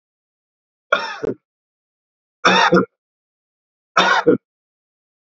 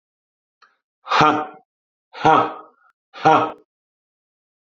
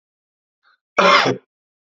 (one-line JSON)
{"three_cough_length": "5.3 s", "three_cough_amplitude": 32768, "three_cough_signal_mean_std_ratio": 0.34, "exhalation_length": "4.7 s", "exhalation_amplitude": 28003, "exhalation_signal_mean_std_ratio": 0.34, "cough_length": "2.0 s", "cough_amplitude": 28911, "cough_signal_mean_std_ratio": 0.34, "survey_phase": "beta (2021-08-13 to 2022-03-07)", "age": "45-64", "gender": "Male", "wearing_mask": "No", "symptom_none": true, "smoker_status": "Current smoker (1 to 10 cigarettes per day)", "respiratory_condition_asthma": false, "respiratory_condition_other": false, "recruitment_source": "Test and Trace", "submission_delay": "1 day", "covid_test_result": "Positive", "covid_test_method": "RT-qPCR", "covid_ct_value": 23.8, "covid_ct_gene": "N gene"}